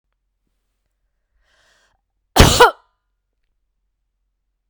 {
  "cough_length": "4.7 s",
  "cough_amplitude": 32768,
  "cough_signal_mean_std_ratio": 0.2,
  "survey_phase": "beta (2021-08-13 to 2022-03-07)",
  "age": "45-64",
  "gender": "Female",
  "wearing_mask": "No",
  "symptom_cough_any": true,
  "symptom_runny_or_blocked_nose": true,
  "symptom_fatigue": true,
  "symptom_headache": true,
  "symptom_other": true,
  "smoker_status": "Never smoked",
  "respiratory_condition_asthma": false,
  "respiratory_condition_other": false,
  "recruitment_source": "Test and Trace",
  "submission_delay": "2 days",
  "covid_test_result": "Positive",
  "covid_test_method": "RT-qPCR",
  "covid_ct_value": 23.6,
  "covid_ct_gene": "N gene"
}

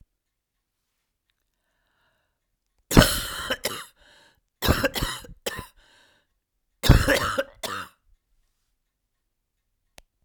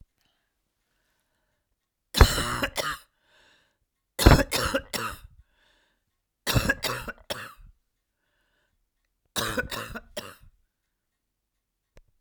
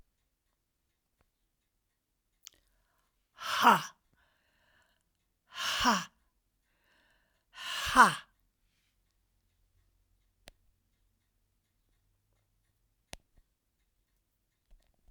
{
  "cough_length": "10.2 s",
  "cough_amplitude": 32767,
  "cough_signal_mean_std_ratio": 0.27,
  "three_cough_length": "12.2 s",
  "three_cough_amplitude": 32768,
  "three_cough_signal_mean_std_ratio": 0.27,
  "exhalation_length": "15.1 s",
  "exhalation_amplitude": 15777,
  "exhalation_signal_mean_std_ratio": 0.19,
  "survey_phase": "alpha (2021-03-01 to 2021-08-12)",
  "age": "65+",
  "gender": "Female",
  "wearing_mask": "No",
  "symptom_new_continuous_cough": true,
  "symptom_onset": "8 days",
  "smoker_status": "Never smoked",
  "respiratory_condition_asthma": false,
  "respiratory_condition_other": false,
  "recruitment_source": "REACT",
  "submission_delay": "2 days",
  "covid_test_result": "Negative",
  "covid_test_method": "RT-qPCR"
}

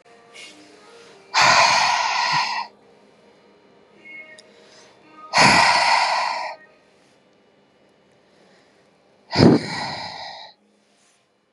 {
  "exhalation_length": "11.5 s",
  "exhalation_amplitude": 32527,
  "exhalation_signal_mean_std_ratio": 0.42,
  "survey_phase": "beta (2021-08-13 to 2022-03-07)",
  "age": "45-64",
  "gender": "Female",
  "wearing_mask": "No",
  "symptom_none": true,
  "smoker_status": "Never smoked",
  "respiratory_condition_asthma": false,
  "respiratory_condition_other": false,
  "recruitment_source": "REACT",
  "submission_delay": "2 days",
  "covid_test_result": "Negative",
  "covid_test_method": "RT-qPCR",
  "influenza_a_test_result": "Negative",
  "influenza_b_test_result": "Negative"
}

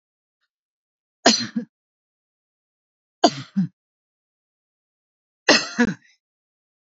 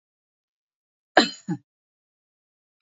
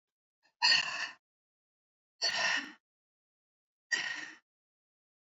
{
  "three_cough_length": "7.0 s",
  "three_cough_amplitude": 29146,
  "three_cough_signal_mean_std_ratio": 0.24,
  "cough_length": "2.8 s",
  "cough_amplitude": 27245,
  "cough_signal_mean_std_ratio": 0.17,
  "exhalation_length": "5.3 s",
  "exhalation_amplitude": 6725,
  "exhalation_signal_mean_std_ratio": 0.35,
  "survey_phase": "alpha (2021-03-01 to 2021-08-12)",
  "age": "65+",
  "gender": "Female",
  "wearing_mask": "No",
  "symptom_none": true,
  "smoker_status": "Ex-smoker",
  "respiratory_condition_asthma": false,
  "respiratory_condition_other": false,
  "recruitment_source": "REACT",
  "submission_delay": "3 days",
  "covid_test_result": "Negative",
  "covid_test_method": "RT-qPCR",
  "covid_ct_value": 42.0,
  "covid_ct_gene": "N gene"
}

